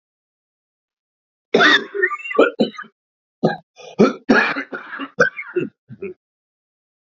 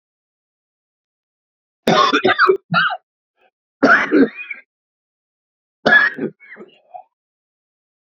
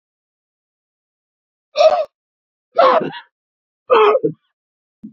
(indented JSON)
{
  "cough_length": "7.1 s",
  "cough_amplitude": 28184,
  "cough_signal_mean_std_ratio": 0.38,
  "three_cough_length": "8.1 s",
  "three_cough_amplitude": 32768,
  "three_cough_signal_mean_std_ratio": 0.37,
  "exhalation_length": "5.1 s",
  "exhalation_amplitude": 30004,
  "exhalation_signal_mean_std_ratio": 0.35,
  "survey_phase": "beta (2021-08-13 to 2022-03-07)",
  "age": "45-64",
  "gender": "Male",
  "wearing_mask": "No",
  "symptom_cough_any": true,
  "symptom_runny_or_blocked_nose": true,
  "symptom_shortness_of_breath": true,
  "symptom_sore_throat": true,
  "symptom_fatigue": true,
  "smoker_status": "Never smoked",
  "respiratory_condition_asthma": false,
  "respiratory_condition_other": true,
  "recruitment_source": "Test and Trace",
  "submission_delay": "1 day",
  "covid_test_result": "Positive",
  "covid_test_method": "RT-qPCR",
  "covid_ct_value": 34.8,
  "covid_ct_gene": "ORF1ab gene"
}